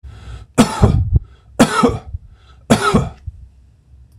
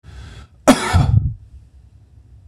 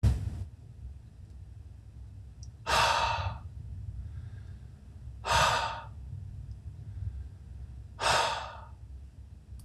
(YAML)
three_cough_length: 4.2 s
three_cough_amplitude: 26028
three_cough_signal_mean_std_ratio: 0.47
cough_length: 2.5 s
cough_amplitude: 26028
cough_signal_mean_std_ratio: 0.42
exhalation_length: 9.6 s
exhalation_amplitude: 7027
exhalation_signal_mean_std_ratio: 0.59
survey_phase: beta (2021-08-13 to 2022-03-07)
age: 45-64
gender: Male
wearing_mask: 'No'
symptom_none: true
smoker_status: Never smoked
respiratory_condition_asthma: false
respiratory_condition_other: false
recruitment_source: REACT
submission_delay: 1 day
covid_test_result: Negative
covid_test_method: RT-qPCR
influenza_a_test_result: Negative
influenza_b_test_result: Negative